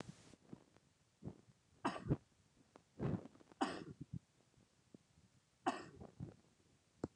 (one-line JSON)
{"three_cough_length": "7.2 s", "three_cough_amplitude": 2072, "three_cough_signal_mean_std_ratio": 0.34, "survey_phase": "beta (2021-08-13 to 2022-03-07)", "age": "65+", "gender": "Male", "wearing_mask": "No", "symptom_fatigue": true, "symptom_headache": true, "smoker_status": "Ex-smoker", "respiratory_condition_asthma": false, "respiratory_condition_other": false, "recruitment_source": "REACT", "submission_delay": "2 days", "covid_test_result": "Negative", "covid_test_method": "RT-qPCR", "influenza_a_test_result": "Unknown/Void", "influenza_b_test_result": "Unknown/Void"}